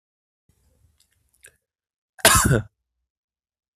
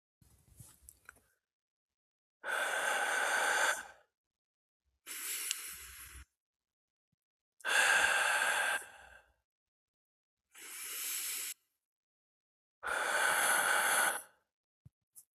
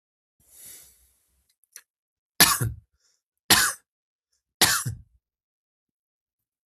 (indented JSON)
{
  "cough_length": "3.8 s",
  "cough_amplitude": 32766,
  "cough_signal_mean_std_ratio": 0.24,
  "exhalation_length": "15.4 s",
  "exhalation_amplitude": 7423,
  "exhalation_signal_mean_std_ratio": 0.49,
  "three_cough_length": "6.7 s",
  "three_cough_amplitude": 32768,
  "three_cough_signal_mean_std_ratio": 0.25,
  "survey_phase": "beta (2021-08-13 to 2022-03-07)",
  "age": "18-44",
  "gender": "Male",
  "wearing_mask": "No",
  "symptom_runny_or_blocked_nose": true,
  "symptom_fatigue": true,
  "symptom_fever_high_temperature": true,
  "symptom_other": true,
  "symptom_onset": "3 days",
  "smoker_status": "Never smoked",
  "respiratory_condition_asthma": false,
  "respiratory_condition_other": false,
  "recruitment_source": "Test and Trace",
  "submission_delay": "1 day",
  "covid_test_result": "Positive",
  "covid_test_method": "RT-qPCR",
  "covid_ct_value": 28.4,
  "covid_ct_gene": "N gene"
}